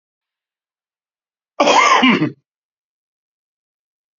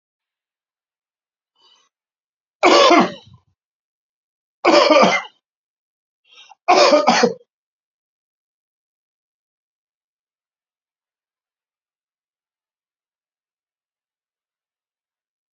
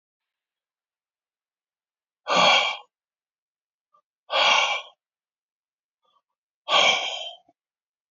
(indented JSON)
{
  "cough_length": "4.2 s",
  "cough_amplitude": 30181,
  "cough_signal_mean_std_ratio": 0.33,
  "three_cough_length": "15.5 s",
  "three_cough_amplitude": 32768,
  "three_cough_signal_mean_std_ratio": 0.26,
  "exhalation_length": "8.1 s",
  "exhalation_amplitude": 17115,
  "exhalation_signal_mean_std_ratio": 0.33,
  "survey_phase": "beta (2021-08-13 to 2022-03-07)",
  "age": "65+",
  "gender": "Male",
  "wearing_mask": "No",
  "symptom_runny_or_blocked_nose": true,
  "symptom_sore_throat": true,
  "smoker_status": "Ex-smoker",
  "respiratory_condition_asthma": false,
  "respiratory_condition_other": false,
  "recruitment_source": "REACT",
  "submission_delay": "2 days",
  "covid_test_result": "Negative",
  "covid_test_method": "RT-qPCR",
  "influenza_a_test_result": "Negative",
  "influenza_b_test_result": "Negative"
}